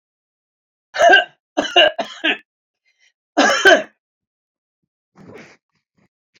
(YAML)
cough_length: 6.4 s
cough_amplitude: 28556
cough_signal_mean_std_ratio: 0.33
survey_phase: beta (2021-08-13 to 2022-03-07)
age: 65+
gender: Male
wearing_mask: 'No'
symptom_none: true
smoker_status: Ex-smoker
respiratory_condition_asthma: false
respiratory_condition_other: false
recruitment_source: REACT
submission_delay: 2 days
covid_test_result: Negative
covid_test_method: RT-qPCR
influenza_a_test_result: Negative
influenza_b_test_result: Negative